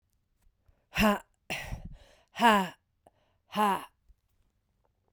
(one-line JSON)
{"exhalation_length": "5.1 s", "exhalation_amplitude": 11377, "exhalation_signal_mean_std_ratio": 0.34, "survey_phase": "beta (2021-08-13 to 2022-03-07)", "age": "18-44", "gender": "Female", "wearing_mask": "No", "symptom_cough_any": true, "symptom_new_continuous_cough": true, "symptom_shortness_of_breath": true, "symptom_sore_throat": true, "symptom_fatigue": true, "symptom_fever_high_temperature": true, "symptom_headache": true, "symptom_onset": "2 days", "smoker_status": "Ex-smoker", "respiratory_condition_asthma": true, "respiratory_condition_other": false, "recruitment_source": "Test and Trace", "submission_delay": "1 day", "covid_test_result": "Positive", "covid_test_method": "RT-qPCR", "covid_ct_value": 23.1, "covid_ct_gene": "N gene"}